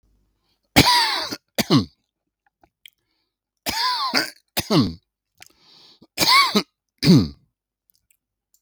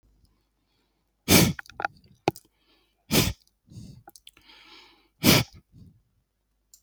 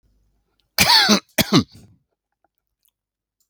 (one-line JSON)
{"three_cough_length": "8.6 s", "three_cough_amplitude": 32768, "three_cough_signal_mean_std_ratio": 0.38, "exhalation_length": "6.8 s", "exhalation_amplitude": 24526, "exhalation_signal_mean_std_ratio": 0.26, "cough_length": "3.5 s", "cough_amplitude": 32768, "cough_signal_mean_std_ratio": 0.33, "survey_phase": "beta (2021-08-13 to 2022-03-07)", "age": "65+", "gender": "Male", "wearing_mask": "No", "symptom_none": true, "smoker_status": "Ex-smoker", "respiratory_condition_asthma": false, "respiratory_condition_other": false, "recruitment_source": "REACT", "submission_delay": "9 days", "covid_test_result": "Negative", "covid_test_method": "RT-qPCR", "influenza_a_test_result": "Negative", "influenza_b_test_result": "Negative"}